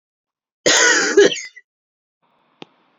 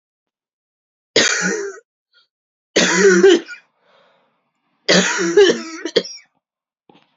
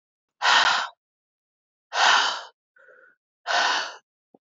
{"cough_length": "3.0 s", "cough_amplitude": 29744, "cough_signal_mean_std_ratio": 0.39, "three_cough_length": "7.2 s", "three_cough_amplitude": 31466, "three_cough_signal_mean_std_ratio": 0.42, "exhalation_length": "4.5 s", "exhalation_amplitude": 17643, "exhalation_signal_mean_std_ratio": 0.43, "survey_phase": "beta (2021-08-13 to 2022-03-07)", "age": "18-44", "gender": "Female", "wearing_mask": "No", "symptom_cough_any": true, "symptom_runny_or_blocked_nose": true, "symptom_shortness_of_breath": true, "symptom_sore_throat": true, "symptom_headache": true, "smoker_status": "Never smoked", "respiratory_condition_asthma": false, "respiratory_condition_other": false, "recruitment_source": "Test and Trace", "submission_delay": "1 day", "covid_test_result": "Positive", "covid_test_method": "LFT"}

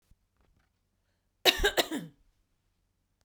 {"cough_length": "3.2 s", "cough_amplitude": 17624, "cough_signal_mean_std_ratio": 0.26, "survey_phase": "beta (2021-08-13 to 2022-03-07)", "age": "45-64", "gender": "Female", "wearing_mask": "No", "symptom_runny_or_blocked_nose": true, "symptom_sore_throat": true, "symptom_headache": true, "symptom_onset": "3 days", "smoker_status": "Ex-smoker", "respiratory_condition_asthma": false, "respiratory_condition_other": false, "recruitment_source": "Test and Trace", "submission_delay": "1 day", "covid_test_result": "Positive", "covid_test_method": "RT-qPCR", "covid_ct_value": 31.0, "covid_ct_gene": "N gene"}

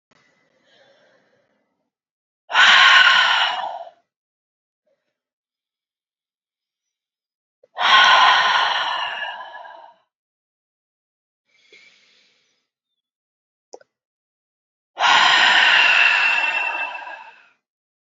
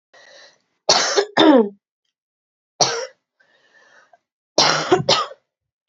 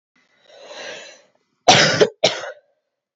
{"exhalation_length": "18.2 s", "exhalation_amplitude": 28924, "exhalation_signal_mean_std_ratio": 0.4, "three_cough_length": "5.9 s", "three_cough_amplitude": 32767, "three_cough_signal_mean_std_ratio": 0.38, "cough_length": "3.2 s", "cough_amplitude": 32768, "cough_signal_mean_std_ratio": 0.34, "survey_phase": "beta (2021-08-13 to 2022-03-07)", "age": "18-44", "gender": "Female", "wearing_mask": "No", "symptom_new_continuous_cough": true, "symptom_runny_or_blocked_nose": true, "symptom_shortness_of_breath": true, "symptom_sore_throat": true, "symptom_headache": true, "symptom_change_to_sense_of_smell_or_taste": true, "smoker_status": "Ex-smoker", "respiratory_condition_asthma": true, "respiratory_condition_other": false, "recruitment_source": "Test and Trace", "submission_delay": "2 days", "covid_test_result": "Positive", "covid_test_method": "LFT"}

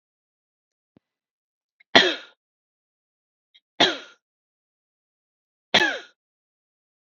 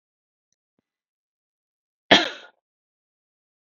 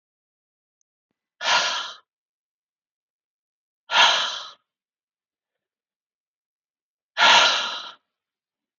{"three_cough_length": "7.1 s", "three_cough_amplitude": 32768, "three_cough_signal_mean_std_ratio": 0.2, "cough_length": "3.8 s", "cough_amplitude": 32768, "cough_signal_mean_std_ratio": 0.14, "exhalation_length": "8.8 s", "exhalation_amplitude": 26203, "exhalation_signal_mean_std_ratio": 0.3, "survey_phase": "beta (2021-08-13 to 2022-03-07)", "age": "18-44", "gender": "Male", "wearing_mask": "No", "symptom_none": true, "smoker_status": "Ex-smoker", "respiratory_condition_asthma": false, "respiratory_condition_other": false, "recruitment_source": "REACT", "submission_delay": "1 day", "covid_test_result": "Negative", "covid_test_method": "RT-qPCR", "influenza_a_test_result": "Negative", "influenza_b_test_result": "Negative"}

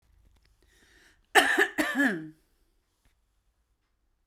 {"cough_length": "4.3 s", "cough_amplitude": 22626, "cough_signal_mean_std_ratio": 0.32, "survey_phase": "beta (2021-08-13 to 2022-03-07)", "age": "45-64", "gender": "Female", "wearing_mask": "No", "symptom_none": true, "smoker_status": "Current smoker (1 to 10 cigarettes per day)", "respiratory_condition_asthma": false, "respiratory_condition_other": false, "recruitment_source": "REACT", "submission_delay": "0 days", "covid_test_result": "Negative", "covid_test_method": "RT-qPCR"}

